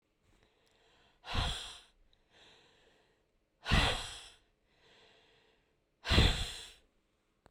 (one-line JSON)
{"exhalation_length": "7.5 s", "exhalation_amplitude": 7710, "exhalation_signal_mean_std_ratio": 0.31, "survey_phase": "beta (2021-08-13 to 2022-03-07)", "age": "45-64", "gender": "Female", "wearing_mask": "No", "symptom_cough_any": true, "symptom_new_continuous_cough": true, "symptom_runny_or_blocked_nose": true, "symptom_shortness_of_breath": true, "symptom_sore_throat": true, "symptom_fatigue": true, "symptom_headache": true, "symptom_change_to_sense_of_smell_or_taste": true, "symptom_loss_of_taste": true, "symptom_onset": "3 days", "smoker_status": "Never smoked", "respiratory_condition_asthma": true, "respiratory_condition_other": false, "recruitment_source": "Test and Trace", "submission_delay": "2 days", "covid_test_result": "Positive", "covid_test_method": "RT-qPCR", "covid_ct_value": 19.4, "covid_ct_gene": "ORF1ab gene", "covid_ct_mean": 20.1, "covid_viral_load": "260000 copies/ml", "covid_viral_load_category": "Low viral load (10K-1M copies/ml)"}